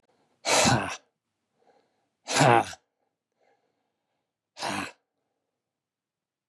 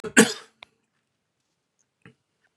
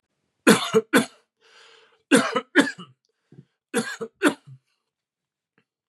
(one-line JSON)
{"exhalation_length": "6.5 s", "exhalation_amplitude": 21577, "exhalation_signal_mean_std_ratio": 0.3, "cough_length": "2.6 s", "cough_amplitude": 31615, "cough_signal_mean_std_ratio": 0.18, "three_cough_length": "5.9 s", "three_cough_amplitude": 29523, "three_cough_signal_mean_std_ratio": 0.31, "survey_phase": "beta (2021-08-13 to 2022-03-07)", "age": "45-64", "gender": "Male", "wearing_mask": "No", "symptom_cough_any": true, "symptom_sore_throat": true, "symptom_headache": true, "smoker_status": "Never smoked", "respiratory_condition_asthma": false, "respiratory_condition_other": false, "recruitment_source": "Test and Trace", "submission_delay": "2 days", "covid_test_result": "Positive", "covid_test_method": "RT-qPCR", "covid_ct_value": 26.6, "covid_ct_gene": "ORF1ab gene", "covid_ct_mean": 27.6, "covid_viral_load": "860 copies/ml", "covid_viral_load_category": "Minimal viral load (< 10K copies/ml)"}